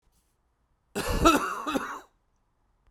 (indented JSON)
{
  "cough_length": "2.9 s",
  "cough_amplitude": 19441,
  "cough_signal_mean_std_ratio": 0.4,
  "survey_phase": "beta (2021-08-13 to 2022-03-07)",
  "age": "45-64",
  "gender": "Male",
  "wearing_mask": "No",
  "symptom_cough_any": true,
  "symptom_runny_or_blocked_nose": true,
  "symptom_shortness_of_breath": true,
  "symptom_fatigue": true,
  "symptom_headache": true,
  "symptom_onset": "3 days",
  "smoker_status": "Never smoked",
  "respiratory_condition_asthma": true,
  "respiratory_condition_other": false,
  "recruitment_source": "Test and Trace",
  "submission_delay": "2 days",
  "covid_test_result": "Positive",
  "covid_test_method": "RT-qPCR"
}